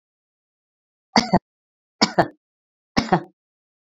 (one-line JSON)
{"three_cough_length": "3.9 s", "three_cough_amplitude": 27309, "three_cough_signal_mean_std_ratio": 0.25, "survey_phase": "beta (2021-08-13 to 2022-03-07)", "age": "45-64", "gender": "Female", "wearing_mask": "No", "symptom_none": true, "smoker_status": "Never smoked", "respiratory_condition_asthma": false, "respiratory_condition_other": true, "recruitment_source": "REACT", "submission_delay": "1 day", "covid_test_result": "Negative", "covid_test_method": "RT-qPCR", "influenza_a_test_result": "Negative", "influenza_b_test_result": "Negative"}